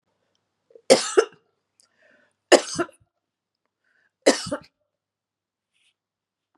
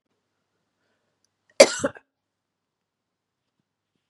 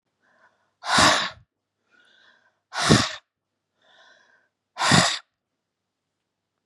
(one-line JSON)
{"three_cough_length": "6.6 s", "three_cough_amplitude": 32509, "three_cough_signal_mean_std_ratio": 0.21, "cough_length": "4.1 s", "cough_amplitude": 32768, "cough_signal_mean_std_ratio": 0.13, "exhalation_length": "6.7 s", "exhalation_amplitude": 26567, "exhalation_signal_mean_std_ratio": 0.32, "survey_phase": "beta (2021-08-13 to 2022-03-07)", "age": "45-64", "gender": "Female", "wearing_mask": "No", "symptom_runny_or_blocked_nose": true, "symptom_abdominal_pain": true, "symptom_headache": true, "smoker_status": "Never smoked", "respiratory_condition_asthma": false, "respiratory_condition_other": false, "recruitment_source": "Test and Trace", "submission_delay": "1 day", "covid_test_result": "Negative", "covid_test_method": "ePCR"}